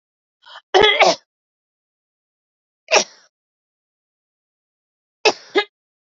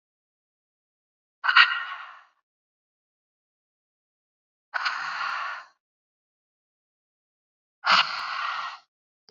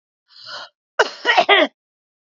{"three_cough_length": "6.1 s", "three_cough_amplitude": 29545, "three_cough_signal_mean_std_ratio": 0.26, "exhalation_length": "9.3 s", "exhalation_amplitude": 26526, "exhalation_signal_mean_std_ratio": 0.3, "cough_length": "2.4 s", "cough_amplitude": 30232, "cough_signal_mean_std_ratio": 0.36, "survey_phase": "beta (2021-08-13 to 2022-03-07)", "age": "18-44", "gender": "Female", "wearing_mask": "No", "symptom_none": true, "smoker_status": "Current smoker (11 or more cigarettes per day)", "respiratory_condition_asthma": false, "respiratory_condition_other": false, "recruitment_source": "REACT", "submission_delay": "4 days", "covid_test_result": "Negative", "covid_test_method": "RT-qPCR", "influenza_a_test_result": "Negative", "influenza_b_test_result": "Negative"}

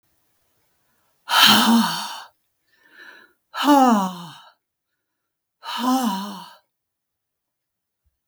{"exhalation_length": "8.3 s", "exhalation_amplitude": 32766, "exhalation_signal_mean_std_ratio": 0.38, "survey_phase": "beta (2021-08-13 to 2022-03-07)", "age": "65+", "gender": "Female", "wearing_mask": "No", "symptom_none": true, "smoker_status": "Never smoked", "respiratory_condition_asthma": false, "respiratory_condition_other": false, "recruitment_source": "REACT", "submission_delay": "0 days", "covid_test_result": "Negative", "covid_test_method": "RT-qPCR", "influenza_a_test_result": "Negative", "influenza_b_test_result": "Negative"}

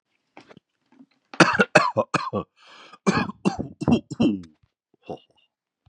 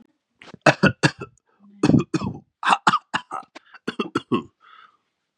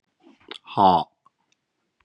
{"cough_length": "5.9 s", "cough_amplitude": 32768, "cough_signal_mean_std_ratio": 0.36, "three_cough_length": "5.4 s", "three_cough_amplitude": 32622, "three_cough_signal_mean_std_ratio": 0.34, "exhalation_length": "2.0 s", "exhalation_amplitude": 21893, "exhalation_signal_mean_std_ratio": 0.29, "survey_phase": "beta (2021-08-13 to 2022-03-07)", "age": "18-44", "gender": "Male", "wearing_mask": "Prefer not to say", "symptom_none": true, "smoker_status": "Never smoked", "respiratory_condition_asthma": false, "respiratory_condition_other": false, "recruitment_source": "Test and Trace", "submission_delay": "-1 day", "covid_test_result": "Negative", "covid_test_method": "LFT"}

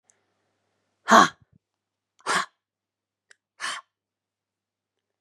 {"exhalation_length": "5.2 s", "exhalation_amplitude": 29891, "exhalation_signal_mean_std_ratio": 0.19, "survey_phase": "beta (2021-08-13 to 2022-03-07)", "age": "45-64", "gender": "Female", "wearing_mask": "No", "symptom_cough_any": true, "symptom_runny_or_blocked_nose": true, "symptom_sore_throat": true, "symptom_fatigue": true, "symptom_headache": true, "symptom_onset": "3 days", "smoker_status": "Never smoked", "respiratory_condition_asthma": true, "respiratory_condition_other": false, "recruitment_source": "Test and Trace", "submission_delay": "1 day", "covid_test_result": "Positive", "covid_test_method": "RT-qPCR", "covid_ct_value": 23.8, "covid_ct_gene": "N gene"}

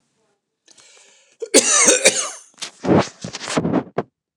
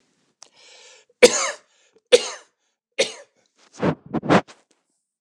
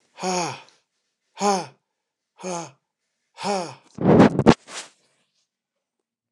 {"cough_length": "4.4 s", "cough_amplitude": 29204, "cough_signal_mean_std_ratio": 0.44, "three_cough_length": "5.2 s", "three_cough_amplitude": 29204, "three_cough_signal_mean_std_ratio": 0.27, "exhalation_length": "6.3 s", "exhalation_amplitude": 29204, "exhalation_signal_mean_std_ratio": 0.31, "survey_phase": "beta (2021-08-13 to 2022-03-07)", "age": "45-64", "gender": "Male", "wearing_mask": "No", "symptom_none": true, "smoker_status": "Ex-smoker", "respiratory_condition_asthma": false, "respiratory_condition_other": false, "recruitment_source": "REACT", "submission_delay": "1 day", "covid_test_result": "Negative", "covid_test_method": "RT-qPCR"}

